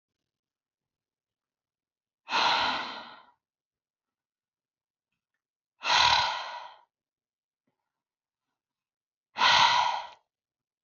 {
  "exhalation_length": "10.8 s",
  "exhalation_amplitude": 12371,
  "exhalation_signal_mean_std_ratio": 0.33,
  "survey_phase": "alpha (2021-03-01 to 2021-08-12)",
  "age": "18-44",
  "gender": "Female",
  "wearing_mask": "No",
  "symptom_none": true,
  "smoker_status": "Never smoked",
  "respiratory_condition_asthma": false,
  "respiratory_condition_other": false,
  "recruitment_source": "REACT",
  "submission_delay": "2 days",
  "covid_test_result": "Negative",
  "covid_test_method": "RT-qPCR"
}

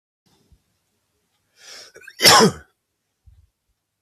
{
  "cough_length": "4.0 s",
  "cough_amplitude": 32768,
  "cough_signal_mean_std_ratio": 0.23,
  "survey_phase": "beta (2021-08-13 to 2022-03-07)",
  "age": "18-44",
  "gender": "Male",
  "wearing_mask": "No",
  "symptom_none": true,
  "smoker_status": "Never smoked",
  "respiratory_condition_asthma": false,
  "respiratory_condition_other": false,
  "recruitment_source": "REACT",
  "submission_delay": "1 day",
  "covid_test_result": "Negative",
  "covid_test_method": "RT-qPCR",
  "influenza_a_test_result": "Negative",
  "influenza_b_test_result": "Negative"
}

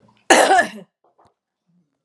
{
  "cough_length": "2.0 s",
  "cough_amplitude": 32767,
  "cough_signal_mean_std_ratio": 0.35,
  "survey_phase": "alpha (2021-03-01 to 2021-08-12)",
  "age": "45-64",
  "gender": "Female",
  "wearing_mask": "No",
  "symptom_fatigue": true,
  "smoker_status": "Never smoked",
  "respiratory_condition_asthma": false,
  "respiratory_condition_other": false,
  "recruitment_source": "Test and Trace",
  "submission_delay": "0 days",
  "covid_test_result": "Negative",
  "covid_test_method": "LFT"
}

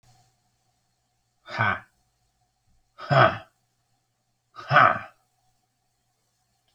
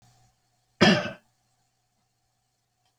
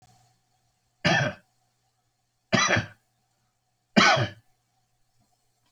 {
  "exhalation_length": "6.7 s",
  "exhalation_amplitude": 25405,
  "exhalation_signal_mean_std_ratio": 0.25,
  "cough_length": "3.0 s",
  "cough_amplitude": 19417,
  "cough_signal_mean_std_ratio": 0.22,
  "three_cough_length": "5.7 s",
  "three_cough_amplitude": 18447,
  "three_cough_signal_mean_std_ratio": 0.31,
  "survey_phase": "beta (2021-08-13 to 2022-03-07)",
  "age": "45-64",
  "gender": "Male",
  "wearing_mask": "No",
  "symptom_none": true,
  "smoker_status": "Never smoked",
  "respiratory_condition_asthma": false,
  "respiratory_condition_other": false,
  "recruitment_source": "REACT",
  "submission_delay": "1 day",
  "covid_test_result": "Negative",
  "covid_test_method": "RT-qPCR"
}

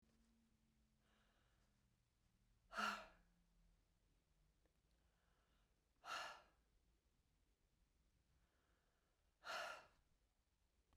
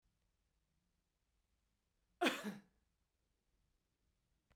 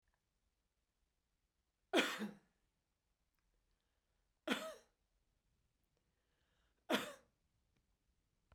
{
  "exhalation_length": "11.0 s",
  "exhalation_amplitude": 723,
  "exhalation_signal_mean_std_ratio": 0.28,
  "cough_length": "4.6 s",
  "cough_amplitude": 3385,
  "cough_signal_mean_std_ratio": 0.19,
  "three_cough_length": "8.5 s",
  "three_cough_amplitude": 3429,
  "three_cough_signal_mean_std_ratio": 0.22,
  "survey_phase": "beta (2021-08-13 to 2022-03-07)",
  "age": "45-64",
  "gender": "Female",
  "wearing_mask": "No",
  "symptom_none": true,
  "smoker_status": "Never smoked",
  "respiratory_condition_asthma": false,
  "respiratory_condition_other": false,
  "recruitment_source": "REACT",
  "submission_delay": "1 day",
  "covid_test_result": "Negative",
  "covid_test_method": "RT-qPCR"
}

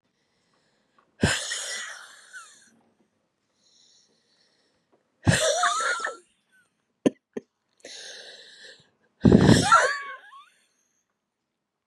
{
  "exhalation_length": "11.9 s",
  "exhalation_amplitude": 26379,
  "exhalation_signal_mean_std_ratio": 0.31,
  "survey_phase": "beta (2021-08-13 to 2022-03-07)",
  "age": "45-64",
  "gender": "Female",
  "wearing_mask": "No",
  "symptom_shortness_of_breath": true,
  "symptom_diarrhoea": true,
  "symptom_fatigue": true,
  "symptom_headache": true,
  "symptom_change_to_sense_of_smell_or_taste": true,
  "symptom_loss_of_taste": true,
  "symptom_onset": "382 days",
  "smoker_status": "Never smoked",
  "respiratory_condition_asthma": true,
  "respiratory_condition_other": false,
  "recruitment_source": "Test and Trace",
  "submission_delay": "3 days",
  "covid_test_result": "Negative",
  "covid_test_method": "RT-qPCR"
}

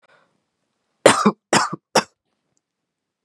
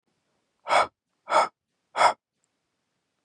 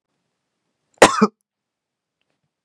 {
  "three_cough_length": "3.2 s",
  "three_cough_amplitude": 32768,
  "three_cough_signal_mean_std_ratio": 0.27,
  "exhalation_length": "3.2 s",
  "exhalation_amplitude": 15604,
  "exhalation_signal_mean_std_ratio": 0.31,
  "cough_length": "2.6 s",
  "cough_amplitude": 32768,
  "cough_signal_mean_std_ratio": 0.19,
  "survey_phase": "beta (2021-08-13 to 2022-03-07)",
  "age": "18-44",
  "gender": "Male",
  "wearing_mask": "No",
  "symptom_none": true,
  "smoker_status": "Never smoked",
  "respiratory_condition_asthma": false,
  "respiratory_condition_other": false,
  "recruitment_source": "REACT",
  "submission_delay": "5 days",
  "covid_test_result": "Negative",
  "covid_test_method": "RT-qPCR",
  "influenza_a_test_result": "Negative",
  "influenza_b_test_result": "Negative"
}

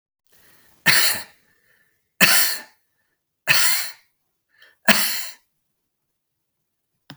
{
  "three_cough_length": "7.2 s",
  "three_cough_amplitude": 32768,
  "three_cough_signal_mean_std_ratio": 0.35,
  "survey_phase": "beta (2021-08-13 to 2022-03-07)",
  "age": "45-64",
  "gender": "Male",
  "wearing_mask": "No",
  "symptom_none": true,
  "smoker_status": "Never smoked",
  "respiratory_condition_asthma": false,
  "respiratory_condition_other": false,
  "recruitment_source": "REACT",
  "submission_delay": "1 day",
  "covid_test_result": "Negative",
  "covid_test_method": "RT-qPCR",
  "influenza_a_test_result": "Negative",
  "influenza_b_test_result": "Negative"
}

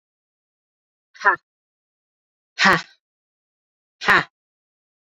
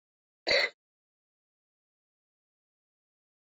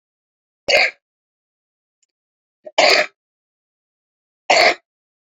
{
  "exhalation_length": "5.0 s",
  "exhalation_amplitude": 30338,
  "exhalation_signal_mean_std_ratio": 0.23,
  "cough_length": "3.4 s",
  "cough_amplitude": 6829,
  "cough_signal_mean_std_ratio": 0.19,
  "three_cough_length": "5.4 s",
  "three_cough_amplitude": 32452,
  "three_cough_signal_mean_std_ratio": 0.29,
  "survey_phase": "beta (2021-08-13 to 2022-03-07)",
  "age": "45-64",
  "gender": "Female",
  "wearing_mask": "Yes",
  "symptom_runny_or_blocked_nose": true,
  "symptom_change_to_sense_of_smell_or_taste": true,
  "symptom_other": true,
  "smoker_status": "Never smoked",
  "respiratory_condition_asthma": false,
  "respiratory_condition_other": false,
  "recruitment_source": "Test and Trace",
  "submission_delay": "2 days",
  "covid_test_result": "Positive",
  "covid_test_method": "RT-qPCR",
  "covid_ct_value": 16.8,
  "covid_ct_gene": "N gene"
}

